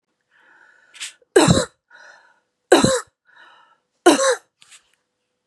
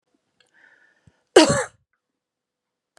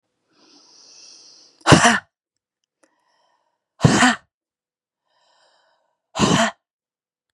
{"three_cough_length": "5.5 s", "three_cough_amplitude": 32673, "three_cough_signal_mean_std_ratio": 0.31, "cough_length": "3.0 s", "cough_amplitude": 32767, "cough_signal_mean_std_ratio": 0.21, "exhalation_length": "7.3 s", "exhalation_amplitude": 32768, "exhalation_signal_mean_std_ratio": 0.28, "survey_phase": "beta (2021-08-13 to 2022-03-07)", "age": "18-44", "gender": "Female", "wearing_mask": "No", "symptom_none": true, "smoker_status": "Ex-smoker", "respiratory_condition_asthma": false, "respiratory_condition_other": false, "recruitment_source": "REACT", "submission_delay": "1 day", "covid_test_result": "Negative", "covid_test_method": "RT-qPCR", "influenza_a_test_result": "Negative", "influenza_b_test_result": "Negative"}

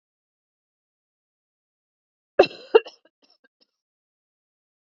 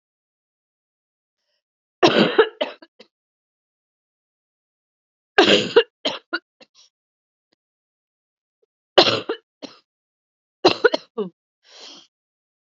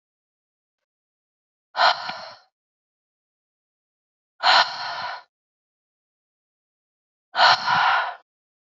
{"cough_length": "4.9 s", "cough_amplitude": 27534, "cough_signal_mean_std_ratio": 0.12, "three_cough_length": "12.6 s", "three_cough_amplitude": 32768, "three_cough_signal_mean_std_ratio": 0.25, "exhalation_length": "8.7 s", "exhalation_amplitude": 24550, "exhalation_signal_mean_std_ratio": 0.32, "survey_phase": "beta (2021-08-13 to 2022-03-07)", "age": "18-44", "gender": "Female", "wearing_mask": "No", "symptom_cough_any": true, "symptom_runny_or_blocked_nose": true, "symptom_sore_throat": true, "symptom_abdominal_pain": true, "symptom_diarrhoea": true, "symptom_fatigue": true, "symptom_fever_high_temperature": true, "symptom_change_to_sense_of_smell_or_taste": true, "symptom_onset": "2 days", "smoker_status": "Never smoked", "respiratory_condition_asthma": false, "respiratory_condition_other": false, "recruitment_source": "Test and Trace", "submission_delay": "1 day", "covid_test_result": "Positive", "covid_test_method": "RT-qPCR", "covid_ct_value": 14.0, "covid_ct_gene": "ORF1ab gene", "covid_ct_mean": 14.6, "covid_viral_load": "17000000 copies/ml", "covid_viral_load_category": "High viral load (>1M copies/ml)"}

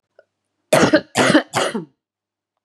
{"three_cough_length": "2.6 s", "three_cough_amplitude": 30578, "three_cough_signal_mean_std_ratio": 0.41, "survey_phase": "beta (2021-08-13 to 2022-03-07)", "age": "45-64", "gender": "Female", "wearing_mask": "No", "symptom_cough_any": true, "symptom_runny_or_blocked_nose": true, "symptom_sore_throat": true, "symptom_fatigue": true, "symptom_headache": true, "symptom_onset": "3 days", "smoker_status": "Never smoked", "respiratory_condition_asthma": true, "respiratory_condition_other": false, "recruitment_source": "Test and Trace", "submission_delay": "1 day", "covid_test_result": "Positive", "covid_test_method": "RT-qPCR", "covid_ct_value": 23.8, "covid_ct_gene": "N gene"}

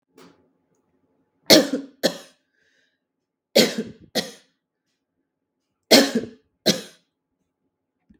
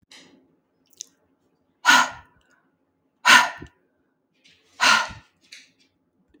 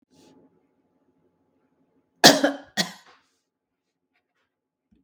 {"three_cough_length": "8.2 s", "three_cough_amplitude": 32768, "three_cough_signal_mean_std_ratio": 0.25, "exhalation_length": "6.4 s", "exhalation_amplitude": 32329, "exhalation_signal_mean_std_ratio": 0.26, "cough_length": "5.0 s", "cough_amplitude": 32768, "cough_signal_mean_std_ratio": 0.18, "survey_phase": "beta (2021-08-13 to 2022-03-07)", "age": "45-64", "gender": "Female", "wearing_mask": "No", "symptom_none": true, "smoker_status": "Ex-smoker", "respiratory_condition_asthma": false, "respiratory_condition_other": false, "recruitment_source": "REACT", "submission_delay": "1 day", "covid_test_result": "Negative", "covid_test_method": "RT-qPCR", "influenza_a_test_result": "Negative", "influenza_b_test_result": "Negative"}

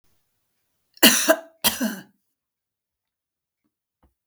{"cough_length": "4.3 s", "cough_amplitude": 32768, "cough_signal_mean_std_ratio": 0.25, "survey_phase": "beta (2021-08-13 to 2022-03-07)", "age": "65+", "gender": "Female", "wearing_mask": "No", "symptom_none": true, "smoker_status": "Never smoked", "respiratory_condition_asthma": false, "respiratory_condition_other": false, "recruitment_source": "REACT", "submission_delay": "0 days", "covid_test_result": "Negative", "covid_test_method": "RT-qPCR", "influenza_a_test_result": "Negative", "influenza_b_test_result": "Negative"}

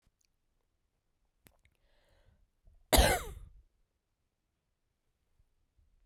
{"cough_length": "6.1 s", "cough_amplitude": 12716, "cough_signal_mean_std_ratio": 0.19, "survey_phase": "beta (2021-08-13 to 2022-03-07)", "age": "18-44", "gender": "Female", "wearing_mask": "No", "symptom_cough_any": true, "symptom_runny_or_blocked_nose": true, "symptom_sore_throat": true, "symptom_fatigue": true, "symptom_headache": true, "smoker_status": "Never smoked", "respiratory_condition_asthma": false, "respiratory_condition_other": false, "recruitment_source": "Test and Trace", "submission_delay": "1 day", "covid_test_result": "Positive", "covid_test_method": "RT-qPCR", "covid_ct_value": 26.0, "covid_ct_gene": "N gene"}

